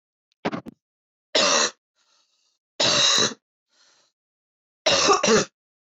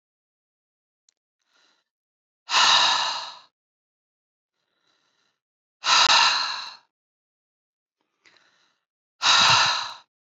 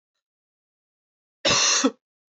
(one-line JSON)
{"three_cough_length": "5.8 s", "three_cough_amplitude": 17433, "three_cough_signal_mean_std_ratio": 0.43, "exhalation_length": "10.3 s", "exhalation_amplitude": 16165, "exhalation_signal_mean_std_ratio": 0.36, "cough_length": "2.3 s", "cough_amplitude": 15070, "cough_signal_mean_std_ratio": 0.37, "survey_phase": "beta (2021-08-13 to 2022-03-07)", "age": "18-44", "gender": "Female", "wearing_mask": "No", "symptom_cough_any": true, "symptom_new_continuous_cough": true, "symptom_runny_or_blocked_nose": true, "symptom_sore_throat": true, "symptom_fatigue": true, "symptom_headache": true, "symptom_onset": "2 days", "smoker_status": "Never smoked", "respiratory_condition_asthma": true, "respiratory_condition_other": false, "recruitment_source": "Test and Trace", "submission_delay": "2 days", "covid_test_result": "Positive", "covid_test_method": "ePCR"}